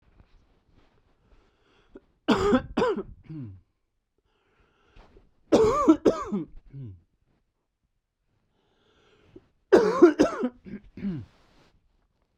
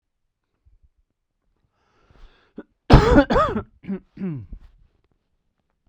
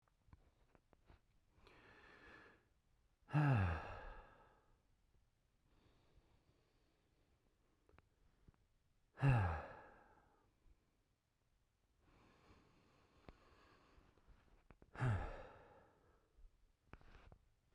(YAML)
three_cough_length: 12.4 s
three_cough_amplitude: 22359
three_cough_signal_mean_std_ratio: 0.32
cough_length: 5.9 s
cough_amplitude: 32768
cough_signal_mean_std_ratio: 0.27
exhalation_length: 17.7 s
exhalation_amplitude: 1926
exhalation_signal_mean_std_ratio: 0.27
survey_phase: beta (2021-08-13 to 2022-03-07)
age: 18-44
gender: Male
wearing_mask: 'No'
symptom_none: true
smoker_status: Ex-smoker
respiratory_condition_asthma: false
respiratory_condition_other: false
recruitment_source: REACT
submission_delay: 2 days
covid_test_result: Negative
covid_test_method: RT-qPCR